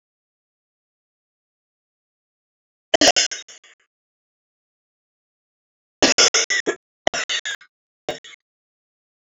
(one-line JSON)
{"three_cough_length": "9.3 s", "three_cough_amplitude": 29699, "three_cough_signal_mean_std_ratio": 0.25, "survey_phase": "beta (2021-08-13 to 2022-03-07)", "age": "45-64", "gender": "Female", "wearing_mask": "No", "symptom_cough_any": true, "symptom_runny_or_blocked_nose": true, "symptom_shortness_of_breath": true, "symptom_sore_throat": true, "symptom_abdominal_pain": true, "symptom_diarrhoea": true, "symptom_headache": true, "symptom_onset": "3 days", "smoker_status": "Never smoked", "respiratory_condition_asthma": false, "respiratory_condition_other": false, "recruitment_source": "Test and Trace", "submission_delay": "2 days", "covid_test_result": "Positive", "covid_test_method": "RT-qPCR", "covid_ct_value": 16.5, "covid_ct_gene": "ORF1ab gene", "covid_ct_mean": 16.9, "covid_viral_load": "2900000 copies/ml", "covid_viral_load_category": "High viral load (>1M copies/ml)"}